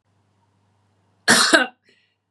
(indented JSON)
{
  "cough_length": "2.3 s",
  "cough_amplitude": 31543,
  "cough_signal_mean_std_ratio": 0.32,
  "survey_phase": "beta (2021-08-13 to 2022-03-07)",
  "age": "45-64",
  "gender": "Female",
  "wearing_mask": "No",
  "symptom_none": true,
  "smoker_status": "Never smoked",
  "respiratory_condition_asthma": false,
  "respiratory_condition_other": false,
  "recruitment_source": "REACT",
  "submission_delay": "5 days",
  "covid_test_result": "Negative",
  "covid_test_method": "RT-qPCR",
  "influenza_a_test_result": "Negative",
  "influenza_b_test_result": "Negative"
}